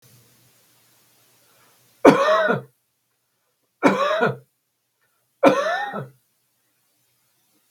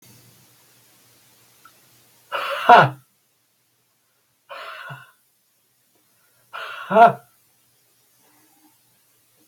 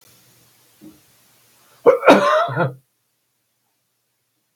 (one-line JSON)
{"three_cough_length": "7.7 s", "three_cough_amplitude": 32768, "three_cough_signal_mean_std_ratio": 0.33, "exhalation_length": "9.5 s", "exhalation_amplitude": 32768, "exhalation_signal_mean_std_ratio": 0.21, "cough_length": "4.6 s", "cough_amplitude": 32768, "cough_signal_mean_std_ratio": 0.3, "survey_phase": "beta (2021-08-13 to 2022-03-07)", "age": "65+", "gender": "Male", "wearing_mask": "No", "symptom_none": true, "symptom_onset": "2 days", "smoker_status": "Never smoked", "respiratory_condition_asthma": false, "respiratory_condition_other": false, "recruitment_source": "Test and Trace", "submission_delay": "1 day", "covid_test_result": "Negative", "covid_test_method": "RT-qPCR"}